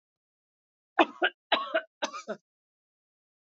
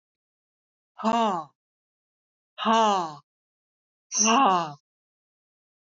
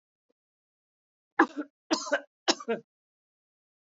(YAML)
cough_length: 3.4 s
cough_amplitude: 13405
cough_signal_mean_std_ratio: 0.27
exhalation_length: 5.8 s
exhalation_amplitude: 12385
exhalation_signal_mean_std_ratio: 0.39
three_cough_length: 3.8 s
three_cough_amplitude: 14496
three_cough_signal_mean_std_ratio: 0.25
survey_phase: alpha (2021-03-01 to 2021-08-12)
age: 65+
gender: Female
wearing_mask: 'No'
symptom_none: true
smoker_status: Never smoked
respiratory_condition_asthma: false
respiratory_condition_other: false
recruitment_source: REACT
submission_delay: 2 days
covid_test_result: Negative
covid_test_method: RT-qPCR